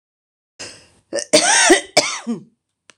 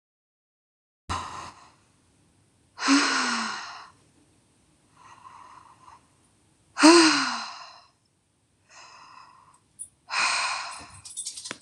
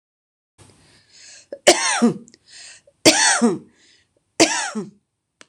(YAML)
cough_length: 3.0 s
cough_amplitude: 26028
cough_signal_mean_std_ratio: 0.42
exhalation_length: 11.6 s
exhalation_amplitude: 25993
exhalation_signal_mean_std_ratio: 0.33
three_cough_length: 5.5 s
three_cough_amplitude: 26028
three_cough_signal_mean_std_ratio: 0.37
survey_phase: beta (2021-08-13 to 2022-03-07)
age: 45-64
gender: Female
wearing_mask: 'No'
symptom_headache: true
symptom_onset: 13 days
smoker_status: Never smoked
respiratory_condition_asthma: false
respiratory_condition_other: false
recruitment_source: REACT
submission_delay: 5 days
covid_test_result: Negative
covid_test_method: RT-qPCR